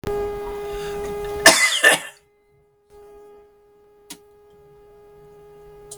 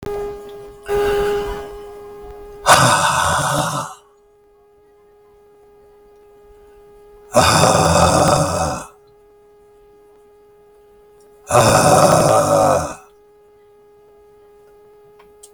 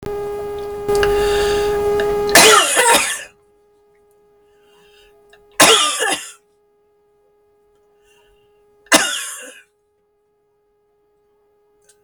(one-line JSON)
{"cough_length": "6.0 s", "cough_amplitude": 32768, "cough_signal_mean_std_ratio": 0.38, "exhalation_length": "15.5 s", "exhalation_amplitude": 32768, "exhalation_signal_mean_std_ratio": 0.5, "three_cough_length": "12.0 s", "three_cough_amplitude": 32768, "three_cough_signal_mean_std_ratio": 0.45, "survey_phase": "beta (2021-08-13 to 2022-03-07)", "age": "65+", "gender": "Male", "wearing_mask": "No", "symptom_none": true, "smoker_status": "Ex-smoker", "respiratory_condition_asthma": false, "respiratory_condition_other": false, "recruitment_source": "REACT", "submission_delay": "1 day", "covid_test_result": "Negative", "covid_test_method": "RT-qPCR"}